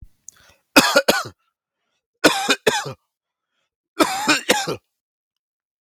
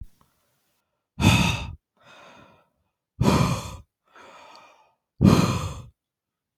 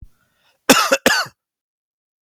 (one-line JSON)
{"three_cough_length": "5.8 s", "three_cough_amplitude": 32768, "three_cough_signal_mean_std_ratio": 0.36, "exhalation_length": "6.6 s", "exhalation_amplitude": 23842, "exhalation_signal_mean_std_ratio": 0.36, "cough_length": "2.2 s", "cough_amplitude": 32768, "cough_signal_mean_std_ratio": 0.34, "survey_phase": "beta (2021-08-13 to 2022-03-07)", "age": "18-44", "gender": "Male", "wearing_mask": "No", "symptom_runny_or_blocked_nose": true, "smoker_status": "Ex-smoker", "respiratory_condition_asthma": false, "respiratory_condition_other": false, "recruitment_source": "REACT", "submission_delay": "1 day", "covid_test_result": "Negative", "covid_test_method": "RT-qPCR"}